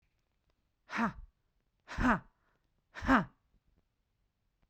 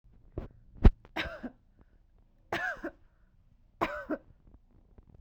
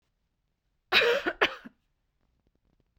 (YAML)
exhalation_length: 4.7 s
exhalation_amplitude: 6251
exhalation_signal_mean_std_ratio: 0.29
three_cough_length: 5.2 s
three_cough_amplitude: 15071
three_cough_signal_mean_std_ratio: 0.23
cough_length: 3.0 s
cough_amplitude: 14022
cough_signal_mean_std_ratio: 0.31
survey_phase: beta (2021-08-13 to 2022-03-07)
age: 45-64
gender: Female
wearing_mask: 'No'
symptom_cough_any: true
symptom_runny_or_blocked_nose: true
symptom_shortness_of_breath: true
symptom_sore_throat: true
symptom_onset: 11 days
smoker_status: Never smoked
respiratory_condition_asthma: true
respiratory_condition_other: false
recruitment_source: REACT
submission_delay: 1 day
covid_test_result: Negative
covid_test_method: RT-qPCR